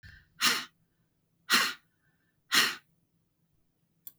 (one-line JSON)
{"exhalation_length": "4.2 s", "exhalation_amplitude": 11154, "exhalation_signal_mean_std_ratio": 0.31, "survey_phase": "beta (2021-08-13 to 2022-03-07)", "age": "45-64", "gender": "Female", "wearing_mask": "No", "symptom_runny_or_blocked_nose": true, "smoker_status": "Never smoked", "respiratory_condition_asthma": false, "respiratory_condition_other": false, "recruitment_source": "REACT", "submission_delay": "0 days", "covid_test_result": "Negative", "covid_test_method": "RT-qPCR", "influenza_a_test_result": "Unknown/Void", "influenza_b_test_result": "Unknown/Void"}